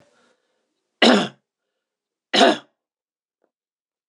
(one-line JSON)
{"three_cough_length": "4.1 s", "three_cough_amplitude": 26028, "three_cough_signal_mean_std_ratio": 0.26, "survey_phase": "beta (2021-08-13 to 2022-03-07)", "age": "65+", "gender": "Male", "wearing_mask": "No", "symptom_none": true, "smoker_status": "Never smoked", "respiratory_condition_asthma": false, "respiratory_condition_other": false, "recruitment_source": "REACT", "submission_delay": "1 day", "covid_test_result": "Negative", "covid_test_method": "RT-qPCR"}